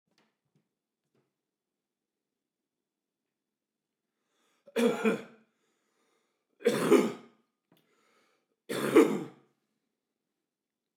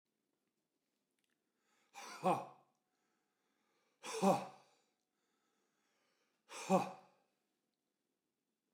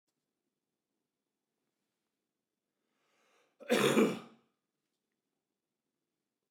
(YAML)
three_cough_length: 11.0 s
three_cough_amplitude: 11636
three_cough_signal_mean_std_ratio: 0.25
exhalation_length: 8.7 s
exhalation_amplitude: 3329
exhalation_signal_mean_std_ratio: 0.24
cough_length: 6.5 s
cough_amplitude: 6035
cough_signal_mean_std_ratio: 0.21
survey_phase: beta (2021-08-13 to 2022-03-07)
age: 45-64
gender: Male
wearing_mask: 'No'
symptom_none: true
symptom_onset: 12 days
smoker_status: Never smoked
respiratory_condition_asthma: false
respiratory_condition_other: false
recruitment_source: REACT
submission_delay: 2 days
covid_test_result: Negative
covid_test_method: RT-qPCR
influenza_a_test_result: Negative
influenza_b_test_result: Negative